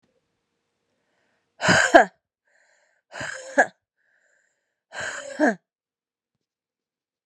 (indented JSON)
{
  "exhalation_length": "7.3 s",
  "exhalation_amplitude": 32767,
  "exhalation_signal_mean_std_ratio": 0.24,
  "survey_phase": "beta (2021-08-13 to 2022-03-07)",
  "age": "45-64",
  "gender": "Female",
  "wearing_mask": "No",
  "symptom_cough_any": true,
  "symptom_new_continuous_cough": true,
  "symptom_runny_or_blocked_nose": true,
  "symptom_sore_throat": true,
  "symptom_fatigue": true,
  "symptom_headache": true,
  "symptom_other": true,
  "smoker_status": "Never smoked",
  "respiratory_condition_asthma": false,
  "respiratory_condition_other": false,
  "recruitment_source": "Test and Trace",
  "submission_delay": "1 day",
  "covid_test_result": "Positive",
  "covid_test_method": "RT-qPCR",
  "covid_ct_value": 27.3,
  "covid_ct_gene": "ORF1ab gene",
  "covid_ct_mean": 28.0,
  "covid_viral_load": "660 copies/ml",
  "covid_viral_load_category": "Minimal viral load (< 10K copies/ml)"
}